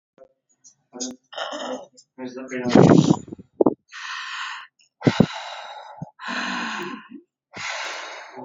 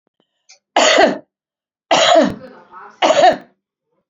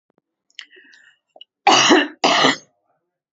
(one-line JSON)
{"exhalation_length": "8.4 s", "exhalation_amplitude": 31525, "exhalation_signal_mean_std_ratio": 0.38, "three_cough_length": "4.1 s", "three_cough_amplitude": 30676, "three_cough_signal_mean_std_ratio": 0.46, "cough_length": "3.3 s", "cough_amplitude": 30304, "cough_signal_mean_std_ratio": 0.39, "survey_phase": "beta (2021-08-13 to 2022-03-07)", "age": "45-64", "gender": "Female", "wearing_mask": "No", "symptom_cough_any": true, "smoker_status": "Never smoked", "respiratory_condition_asthma": false, "respiratory_condition_other": false, "recruitment_source": "REACT", "submission_delay": "28 days", "covid_test_result": "Negative", "covid_test_method": "RT-qPCR", "influenza_a_test_result": "Negative", "influenza_b_test_result": "Negative"}